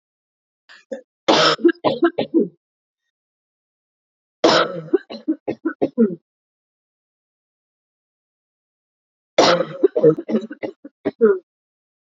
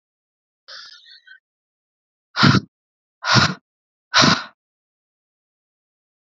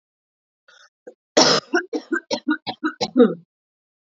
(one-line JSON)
{"three_cough_length": "12.0 s", "three_cough_amplitude": 30612, "three_cough_signal_mean_std_ratio": 0.36, "exhalation_length": "6.2 s", "exhalation_amplitude": 28865, "exhalation_signal_mean_std_ratio": 0.28, "cough_length": "4.0 s", "cough_amplitude": 29100, "cough_signal_mean_std_ratio": 0.37, "survey_phase": "beta (2021-08-13 to 2022-03-07)", "age": "18-44", "gender": "Female", "wearing_mask": "No", "symptom_runny_or_blocked_nose": true, "symptom_shortness_of_breath": true, "symptom_sore_throat": true, "symptom_fatigue": true, "symptom_headache": true, "smoker_status": "Current smoker (1 to 10 cigarettes per day)", "respiratory_condition_asthma": false, "respiratory_condition_other": false, "recruitment_source": "Test and Trace", "submission_delay": "2 days", "covid_test_result": "Positive", "covid_test_method": "RT-qPCR", "covid_ct_value": 18.6, "covid_ct_gene": "ORF1ab gene", "covid_ct_mean": 19.3, "covid_viral_load": "480000 copies/ml", "covid_viral_load_category": "Low viral load (10K-1M copies/ml)"}